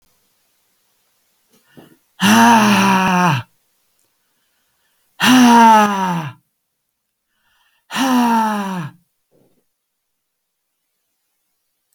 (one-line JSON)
{"exhalation_length": "11.9 s", "exhalation_amplitude": 28778, "exhalation_signal_mean_std_ratio": 0.43, "survey_phase": "beta (2021-08-13 to 2022-03-07)", "age": "65+", "gender": "Male", "wearing_mask": "No", "symptom_cough_any": true, "smoker_status": "Ex-smoker", "respiratory_condition_asthma": false, "respiratory_condition_other": false, "recruitment_source": "REACT", "submission_delay": "1 day", "covid_test_result": "Negative", "covid_test_method": "RT-qPCR"}